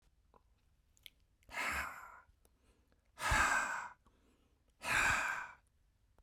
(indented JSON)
{
  "exhalation_length": "6.2 s",
  "exhalation_amplitude": 3244,
  "exhalation_signal_mean_std_ratio": 0.43,
  "survey_phase": "beta (2021-08-13 to 2022-03-07)",
  "age": "45-64",
  "gender": "Male",
  "wearing_mask": "No",
  "symptom_cough_any": true,
  "smoker_status": "Ex-smoker",
  "respiratory_condition_asthma": false,
  "respiratory_condition_other": false,
  "recruitment_source": "Test and Trace",
  "submission_delay": "2 days",
  "covid_test_result": "Positive",
  "covid_test_method": "LFT"
}